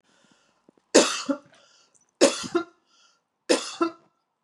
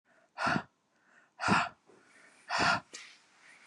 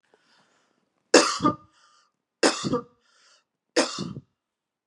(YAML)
cough_length: 4.4 s
cough_amplitude: 27401
cough_signal_mean_std_ratio: 0.31
exhalation_length: 3.7 s
exhalation_amplitude: 6394
exhalation_signal_mean_std_ratio: 0.41
three_cough_length: 4.9 s
three_cough_amplitude: 31065
three_cough_signal_mean_std_ratio: 0.3
survey_phase: beta (2021-08-13 to 2022-03-07)
age: 45-64
gender: Female
wearing_mask: 'No'
symptom_runny_or_blocked_nose: true
symptom_onset: 8 days
smoker_status: Ex-smoker
respiratory_condition_asthma: false
respiratory_condition_other: false
recruitment_source: REACT
submission_delay: 2 days
covid_test_result: Negative
covid_test_method: RT-qPCR
influenza_a_test_result: Negative
influenza_b_test_result: Negative